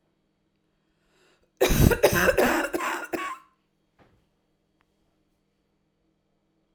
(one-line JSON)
{"cough_length": "6.7 s", "cough_amplitude": 24863, "cough_signal_mean_std_ratio": 0.34, "survey_phase": "alpha (2021-03-01 to 2021-08-12)", "age": "18-44", "gender": "Female", "wearing_mask": "No", "symptom_cough_any": true, "smoker_status": "Never smoked", "respiratory_condition_asthma": false, "respiratory_condition_other": false, "recruitment_source": "REACT", "submission_delay": "2 days", "covid_test_result": "Negative", "covid_test_method": "RT-qPCR"}